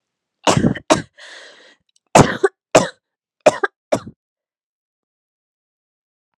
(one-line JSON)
{"cough_length": "6.4 s", "cough_amplitude": 32768, "cough_signal_mean_std_ratio": 0.27, "survey_phase": "alpha (2021-03-01 to 2021-08-12)", "age": "18-44", "gender": "Female", "wearing_mask": "No", "symptom_cough_any": true, "symptom_onset": "6 days", "smoker_status": "Never smoked", "respiratory_condition_asthma": false, "respiratory_condition_other": false, "recruitment_source": "Test and Trace", "submission_delay": "2 days", "covid_test_result": "Positive", "covid_test_method": "RT-qPCR", "covid_ct_value": 12.7, "covid_ct_gene": "N gene", "covid_ct_mean": 13.4, "covid_viral_load": "41000000 copies/ml", "covid_viral_load_category": "High viral load (>1M copies/ml)"}